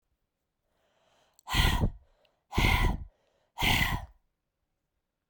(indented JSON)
{
  "exhalation_length": "5.3 s",
  "exhalation_amplitude": 9141,
  "exhalation_signal_mean_std_ratio": 0.41,
  "survey_phase": "beta (2021-08-13 to 2022-03-07)",
  "age": "18-44",
  "gender": "Female",
  "wearing_mask": "No",
  "symptom_cough_any": true,
  "symptom_new_continuous_cough": true,
  "symptom_runny_or_blocked_nose": true,
  "symptom_sore_throat": true,
  "symptom_fatigue": true,
  "symptom_fever_high_temperature": true,
  "symptom_headache": true,
  "symptom_change_to_sense_of_smell_or_taste": true,
  "symptom_onset": "3 days",
  "smoker_status": "Never smoked",
  "respiratory_condition_asthma": false,
  "respiratory_condition_other": false,
  "recruitment_source": "Test and Trace",
  "submission_delay": "2 days",
  "covid_test_result": "Positive",
  "covid_test_method": "RT-qPCR",
  "covid_ct_value": 13.1,
  "covid_ct_gene": "S gene",
  "covid_ct_mean": 13.8,
  "covid_viral_load": "31000000 copies/ml",
  "covid_viral_load_category": "High viral load (>1M copies/ml)"
}